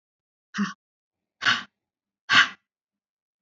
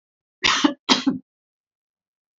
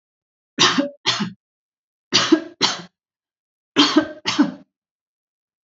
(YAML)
exhalation_length: 3.4 s
exhalation_amplitude: 21868
exhalation_signal_mean_std_ratio: 0.27
cough_length: 2.4 s
cough_amplitude: 32365
cough_signal_mean_std_ratio: 0.34
three_cough_length: 5.6 s
three_cough_amplitude: 31178
three_cough_signal_mean_std_ratio: 0.38
survey_phase: beta (2021-08-13 to 2022-03-07)
age: 65+
gender: Female
wearing_mask: 'No'
symptom_runny_or_blocked_nose: true
smoker_status: Never smoked
respiratory_condition_asthma: false
respiratory_condition_other: false
recruitment_source: REACT
submission_delay: 2 days
covid_test_result: Negative
covid_test_method: RT-qPCR
influenza_a_test_result: Negative
influenza_b_test_result: Negative